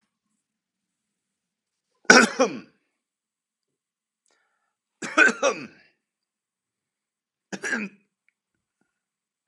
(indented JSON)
{
  "three_cough_length": "9.5 s",
  "three_cough_amplitude": 32768,
  "three_cough_signal_mean_std_ratio": 0.21,
  "survey_phase": "beta (2021-08-13 to 2022-03-07)",
  "age": "45-64",
  "gender": "Male",
  "wearing_mask": "No",
  "symptom_none": true,
  "smoker_status": "Never smoked",
  "respiratory_condition_asthma": false,
  "respiratory_condition_other": false,
  "recruitment_source": "REACT",
  "submission_delay": "4 days",
  "covid_test_result": "Negative",
  "covid_test_method": "RT-qPCR"
}